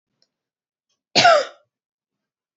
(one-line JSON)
{"cough_length": "2.6 s", "cough_amplitude": 27787, "cough_signal_mean_std_ratio": 0.27, "survey_phase": "beta (2021-08-13 to 2022-03-07)", "age": "18-44", "gender": "Female", "wearing_mask": "No", "symptom_none": true, "smoker_status": "Never smoked", "respiratory_condition_asthma": false, "respiratory_condition_other": false, "recruitment_source": "Test and Trace", "submission_delay": "0 days", "covid_test_result": "Negative", "covid_test_method": "LFT"}